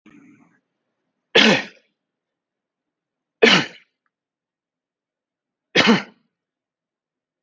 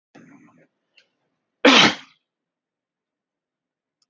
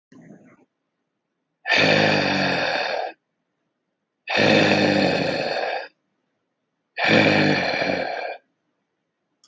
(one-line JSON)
{"three_cough_length": "7.4 s", "three_cough_amplitude": 29189, "three_cough_signal_mean_std_ratio": 0.25, "cough_length": "4.1 s", "cough_amplitude": 27884, "cough_signal_mean_std_ratio": 0.21, "exhalation_length": "9.5 s", "exhalation_amplitude": 23801, "exhalation_signal_mean_std_ratio": 0.57, "survey_phase": "alpha (2021-03-01 to 2021-08-12)", "age": "45-64", "gender": "Male", "wearing_mask": "No", "symptom_none": true, "smoker_status": "Never smoked", "respiratory_condition_asthma": false, "respiratory_condition_other": false, "recruitment_source": "REACT", "submission_delay": "1 day", "covid_test_result": "Negative", "covid_test_method": "RT-qPCR"}